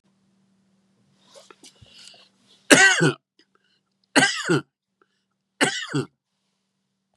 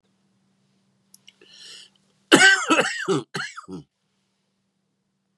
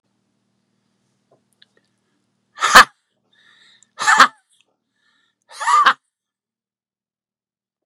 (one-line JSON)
{"three_cough_length": "7.2 s", "three_cough_amplitude": 32768, "three_cough_signal_mean_std_ratio": 0.29, "cough_length": "5.4 s", "cough_amplitude": 31077, "cough_signal_mean_std_ratio": 0.3, "exhalation_length": "7.9 s", "exhalation_amplitude": 32768, "exhalation_signal_mean_std_ratio": 0.22, "survey_phase": "beta (2021-08-13 to 2022-03-07)", "age": "45-64", "gender": "Male", "wearing_mask": "No", "symptom_cough_any": true, "symptom_runny_or_blocked_nose": true, "symptom_change_to_sense_of_smell_or_taste": true, "symptom_onset": "5 days", "smoker_status": "Never smoked", "respiratory_condition_asthma": false, "respiratory_condition_other": false, "recruitment_source": "Test and Trace", "submission_delay": "4 days", "covid_test_result": "Positive", "covid_test_method": "RT-qPCR"}